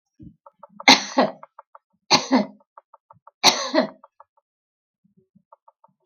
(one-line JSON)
{"three_cough_length": "6.1 s", "three_cough_amplitude": 32768, "three_cough_signal_mean_std_ratio": 0.28, "survey_phase": "beta (2021-08-13 to 2022-03-07)", "age": "65+", "gender": "Female", "wearing_mask": "No", "symptom_none": true, "smoker_status": "Never smoked", "respiratory_condition_asthma": false, "respiratory_condition_other": false, "recruitment_source": "REACT", "submission_delay": "3 days", "covid_test_result": "Negative", "covid_test_method": "RT-qPCR"}